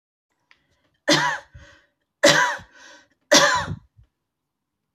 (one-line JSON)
{"three_cough_length": "4.9 s", "three_cough_amplitude": 28852, "three_cough_signal_mean_std_ratio": 0.35, "survey_phase": "beta (2021-08-13 to 2022-03-07)", "age": "45-64", "gender": "Female", "wearing_mask": "No", "symptom_none": true, "smoker_status": "Ex-smoker", "respiratory_condition_asthma": false, "respiratory_condition_other": false, "recruitment_source": "REACT", "submission_delay": "0 days", "covid_test_result": "Negative", "covid_test_method": "RT-qPCR"}